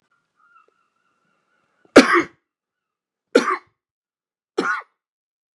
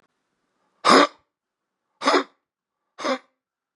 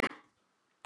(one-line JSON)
{"three_cough_length": "5.5 s", "three_cough_amplitude": 32768, "three_cough_signal_mean_std_ratio": 0.22, "exhalation_length": "3.8 s", "exhalation_amplitude": 27592, "exhalation_signal_mean_std_ratio": 0.28, "cough_length": "0.9 s", "cough_amplitude": 6176, "cough_signal_mean_std_ratio": 0.24, "survey_phase": "beta (2021-08-13 to 2022-03-07)", "age": "65+", "gender": "Male", "wearing_mask": "Yes", "symptom_cough_any": true, "symptom_runny_or_blocked_nose": true, "symptom_shortness_of_breath": true, "symptom_onset": "7 days", "smoker_status": "Ex-smoker", "respiratory_condition_asthma": false, "respiratory_condition_other": false, "recruitment_source": "REACT", "submission_delay": "0 days", "covid_test_result": "Positive", "covid_test_method": "RT-qPCR", "covid_ct_value": 24.0, "covid_ct_gene": "E gene"}